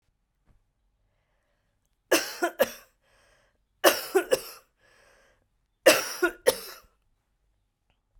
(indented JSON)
{
  "three_cough_length": "8.2 s",
  "three_cough_amplitude": 24024,
  "three_cough_signal_mean_std_ratio": 0.26,
  "survey_phase": "beta (2021-08-13 to 2022-03-07)",
  "age": "45-64",
  "gender": "Female",
  "wearing_mask": "No",
  "symptom_cough_any": true,
  "symptom_new_continuous_cough": true,
  "symptom_runny_or_blocked_nose": true,
  "symptom_sore_throat": true,
  "symptom_fatigue": true,
  "symptom_fever_high_temperature": true,
  "symptom_headache": true,
  "symptom_change_to_sense_of_smell_or_taste": true,
  "symptom_loss_of_taste": true,
  "symptom_onset": "3 days",
  "smoker_status": "Never smoked",
  "respiratory_condition_asthma": false,
  "respiratory_condition_other": false,
  "recruitment_source": "Test and Trace",
  "submission_delay": "1 day",
  "covid_test_result": "Positive",
  "covid_test_method": "RT-qPCR",
  "covid_ct_value": 24.0,
  "covid_ct_gene": "ORF1ab gene",
  "covid_ct_mean": 24.4,
  "covid_viral_load": "9800 copies/ml",
  "covid_viral_load_category": "Minimal viral load (< 10K copies/ml)"
}